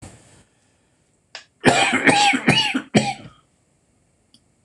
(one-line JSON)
{"cough_length": "4.6 s", "cough_amplitude": 26028, "cough_signal_mean_std_ratio": 0.43, "survey_phase": "beta (2021-08-13 to 2022-03-07)", "age": "65+", "gender": "Male", "wearing_mask": "No", "symptom_cough_any": true, "symptom_runny_or_blocked_nose": true, "symptom_fatigue": true, "symptom_change_to_sense_of_smell_or_taste": true, "smoker_status": "Never smoked", "respiratory_condition_asthma": true, "respiratory_condition_other": false, "recruitment_source": "Test and Trace", "submission_delay": "1 day", "covid_test_result": "Positive", "covid_test_method": "LFT"}